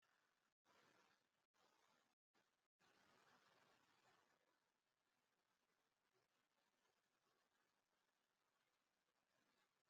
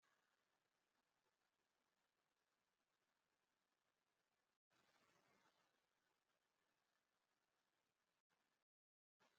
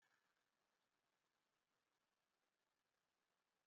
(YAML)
exhalation_length: 9.9 s
exhalation_amplitude: 23
exhalation_signal_mean_std_ratio: 0.51
three_cough_length: 9.4 s
three_cough_amplitude: 19
three_cough_signal_mean_std_ratio: 0.46
cough_length: 3.7 s
cough_amplitude: 11
cough_signal_mean_std_ratio: 0.49
survey_phase: beta (2021-08-13 to 2022-03-07)
age: 18-44
gender: Female
wearing_mask: 'No'
symptom_cough_any: true
symptom_other: true
symptom_onset: 5 days
smoker_status: Ex-smoker
respiratory_condition_asthma: false
respiratory_condition_other: false
recruitment_source: REACT
submission_delay: 4 days
covid_test_result: Negative
covid_test_method: RT-qPCR
influenza_a_test_result: Negative
influenza_b_test_result: Negative